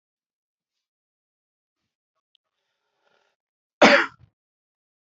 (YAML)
cough_length: 5.0 s
cough_amplitude: 26008
cough_signal_mean_std_ratio: 0.16
survey_phase: beta (2021-08-13 to 2022-03-07)
age: 65+
gender: Male
wearing_mask: 'No'
symptom_none: true
smoker_status: Never smoked
respiratory_condition_asthma: false
respiratory_condition_other: false
recruitment_source: REACT
submission_delay: 7 days
covid_test_result: Negative
covid_test_method: RT-qPCR
influenza_a_test_result: Negative
influenza_b_test_result: Negative